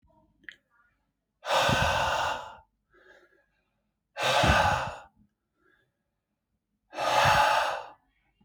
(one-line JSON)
{"exhalation_length": "8.4 s", "exhalation_amplitude": 11176, "exhalation_signal_mean_std_ratio": 0.46, "survey_phase": "beta (2021-08-13 to 2022-03-07)", "age": "18-44", "gender": "Male", "wearing_mask": "No", "symptom_shortness_of_breath": true, "symptom_fatigue": true, "symptom_change_to_sense_of_smell_or_taste": true, "symptom_onset": "3 days", "smoker_status": "Ex-smoker", "respiratory_condition_asthma": false, "respiratory_condition_other": false, "recruitment_source": "Test and Trace", "submission_delay": "2 days", "covid_test_result": "Positive", "covid_test_method": "RT-qPCR", "covid_ct_value": 29.8, "covid_ct_gene": "N gene"}